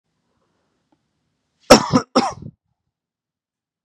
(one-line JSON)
{"cough_length": "3.8 s", "cough_amplitude": 32768, "cough_signal_mean_std_ratio": 0.21, "survey_phase": "beta (2021-08-13 to 2022-03-07)", "age": "18-44", "gender": "Male", "wearing_mask": "Yes", "symptom_none": true, "smoker_status": "Current smoker (e-cigarettes or vapes only)", "respiratory_condition_asthma": false, "respiratory_condition_other": false, "recruitment_source": "REACT", "submission_delay": "1 day", "covid_test_result": "Negative", "covid_test_method": "RT-qPCR", "influenza_a_test_result": "Negative", "influenza_b_test_result": "Negative"}